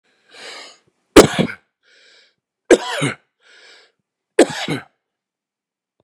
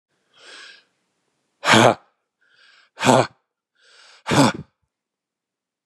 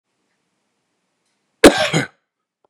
{"three_cough_length": "6.0 s", "three_cough_amplitude": 32768, "three_cough_signal_mean_std_ratio": 0.24, "exhalation_length": "5.9 s", "exhalation_amplitude": 31898, "exhalation_signal_mean_std_ratio": 0.29, "cough_length": "2.7 s", "cough_amplitude": 32768, "cough_signal_mean_std_ratio": 0.23, "survey_phase": "beta (2021-08-13 to 2022-03-07)", "age": "45-64", "gender": "Male", "wearing_mask": "No", "symptom_none": true, "symptom_onset": "12 days", "smoker_status": "Never smoked", "respiratory_condition_asthma": false, "respiratory_condition_other": false, "recruitment_source": "REACT", "submission_delay": "3 days", "covid_test_result": "Negative", "covid_test_method": "RT-qPCR", "influenza_a_test_result": "Negative", "influenza_b_test_result": "Negative"}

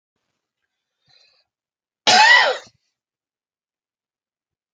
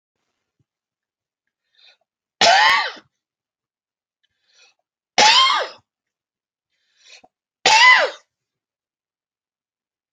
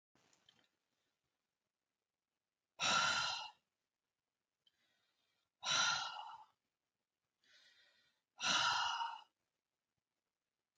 {"cough_length": "4.7 s", "cough_amplitude": 28500, "cough_signal_mean_std_ratio": 0.26, "three_cough_length": "10.1 s", "three_cough_amplitude": 32140, "three_cough_signal_mean_std_ratio": 0.3, "exhalation_length": "10.8 s", "exhalation_amplitude": 3085, "exhalation_signal_mean_std_ratio": 0.35, "survey_phase": "alpha (2021-03-01 to 2021-08-12)", "age": "45-64", "gender": "Male", "wearing_mask": "No", "symptom_none": true, "smoker_status": "Never smoked", "respiratory_condition_asthma": false, "respiratory_condition_other": false, "recruitment_source": "REACT", "submission_delay": "1 day", "covid_test_result": "Negative", "covid_test_method": "RT-qPCR"}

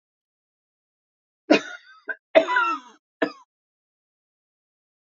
{"cough_length": "5.0 s", "cough_amplitude": 25911, "cough_signal_mean_std_ratio": 0.25, "survey_phase": "alpha (2021-03-01 to 2021-08-12)", "age": "65+", "gender": "Female", "wearing_mask": "No", "symptom_none": true, "smoker_status": "Ex-smoker", "respiratory_condition_asthma": true, "respiratory_condition_other": false, "recruitment_source": "REACT", "submission_delay": "2 days", "covid_test_result": "Negative", "covid_test_method": "RT-qPCR"}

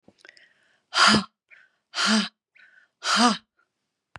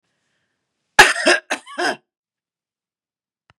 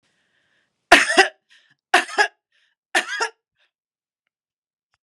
{"exhalation_length": "4.2 s", "exhalation_amplitude": 19524, "exhalation_signal_mean_std_ratio": 0.38, "cough_length": "3.6 s", "cough_amplitude": 32768, "cough_signal_mean_std_ratio": 0.26, "three_cough_length": "5.0 s", "three_cough_amplitude": 32768, "three_cough_signal_mean_std_ratio": 0.27, "survey_phase": "beta (2021-08-13 to 2022-03-07)", "age": "65+", "gender": "Female", "wearing_mask": "No", "symptom_none": true, "smoker_status": "Ex-smoker", "respiratory_condition_asthma": false, "respiratory_condition_other": false, "recruitment_source": "REACT", "submission_delay": "1 day", "covid_test_result": "Negative", "covid_test_method": "RT-qPCR", "influenza_a_test_result": "Negative", "influenza_b_test_result": "Negative"}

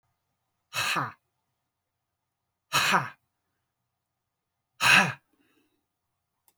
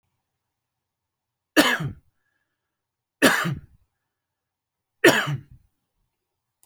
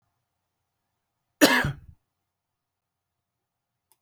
{"exhalation_length": "6.6 s", "exhalation_amplitude": 16495, "exhalation_signal_mean_std_ratio": 0.28, "three_cough_length": "6.7 s", "three_cough_amplitude": 28255, "three_cough_signal_mean_std_ratio": 0.27, "cough_length": "4.0 s", "cough_amplitude": 28249, "cough_signal_mean_std_ratio": 0.2, "survey_phase": "beta (2021-08-13 to 2022-03-07)", "age": "45-64", "gender": "Male", "wearing_mask": "No", "symptom_none": true, "smoker_status": "Never smoked", "respiratory_condition_asthma": true, "respiratory_condition_other": false, "recruitment_source": "REACT", "submission_delay": "21 days", "covid_test_result": "Negative", "covid_test_method": "RT-qPCR"}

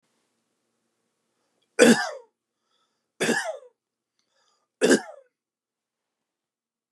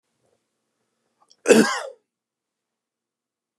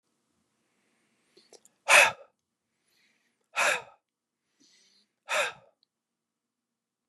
{"three_cough_length": "6.9 s", "three_cough_amplitude": 25601, "three_cough_signal_mean_std_ratio": 0.24, "cough_length": "3.6 s", "cough_amplitude": 31661, "cough_signal_mean_std_ratio": 0.22, "exhalation_length": "7.1 s", "exhalation_amplitude": 17082, "exhalation_signal_mean_std_ratio": 0.22, "survey_phase": "beta (2021-08-13 to 2022-03-07)", "age": "18-44", "gender": "Male", "wearing_mask": "No", "symptom_runny_or_blocked_nose": true, "symptom_onset": "12 days", "smoker_status": "Never smoked", "respiratory_condition_asthma": false, "respiratory_condition_other": false, "recruitment_source": "REACT", "submission_delay": "2 days", "covid_test_result": "Negative", "covid_test_method": "RT-qPCR", "influenza_a_test_result": "Negative", "influenza_b_test_result": "Negative"}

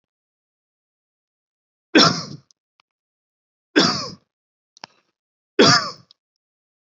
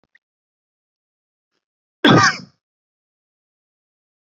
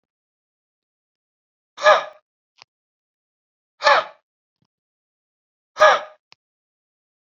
{"three_cough_length": "6.9 s", "three_cough_amplitude": 32767, "three_cough_signal_mean_std_ratio": 0.25, "cough_length": "4.3 s", "cough_amplitude": 30365, "cough_signal_mean_std_ratio": 0.21, "exhalation_length": "7.3 s", "exhalation_amplitude": 28342, "exhalation_signal_mean_std_ratio": 0.22, "survey_phase": "beta (2021-08-13 to 2022-03-07)", "age": "18-44", "gender": "Male", "wearing_mask": "No", "symptom_none": true, "smoker_status": "Never smoked", "respiratory_condition_asthma": false, "respiratory_condition_other": false, "recruitment_source": "REACT", "submission_delay": "2 days", "covid_test_result": "Negative", "covid_test_method": "RT-qPCR", "influenza_a_test_result": "Negative", "influenza_b_test_result": "Negative"}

